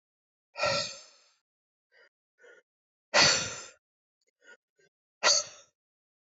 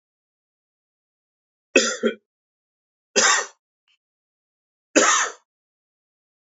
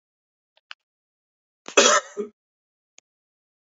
{"exhalation_length": "6.4 s", "exhalation_amplitude": 13733, "exhalation_signal_mean_std_ratio": 0.29, "three_cough_length": "6.6 s", "three_cough_amplitude": 28416, "three_cough_signal_mean_std_ratio": 0.28, "cough_length": "3.7 s", "cough_amplitude": 28378, "cough_signal_mean_std_ratio": 0.22, "survey_phase": "alpha (2021-03-01 to 2021-08-12)", "age": "45-64", "gender": "Male", "wearing_mask": "No", "symptom_cough_any": true, "symptom_fatigue": true, "symptom_headache": true, "smoker_status": "Ex-smoker", "respiratory_condition_asthma": false, "respiratory_condition_other": false, "recruitment_source": "Test and Trace", "submission_delay": "2 days", "covid_test_result": "Positive", "covid_test_method": "RT-qPCR", "covid_ct_value": 21.4, "covid_ct_gene": "S gene", "covid_ct_mean": 21.8, "covid_viral_load": "71000 copies/ml", "covid_viral_load_category": "Low viral load (10K-1M copies/ml)"}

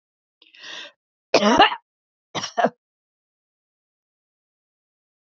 {"cough_length": "5.3 s", "cough_amplitude": 28318, "cough_signal_mean_std_ratio": 0.25, "survey_phase": "alpha (2021-03-01 to 2021-08-12)", "age": "65+", "gender": "Female", "wearing_mask": "No", "symptom_cough_any": true, "symptom_fatigue": true, "symptom_headache": true, "symptom_change_to_sense_of_smell_or_taste": true, "symptom_onset": "13 days", "smoker_status": "Never smoked", "respiratory_condition_asthma": false, "respiratory_condition_other": false, "recruitment_source": "REACT", "submission_delay": "1 day", "covid_test_result": "Negative", "covid_test_method": "RT-qPCR"}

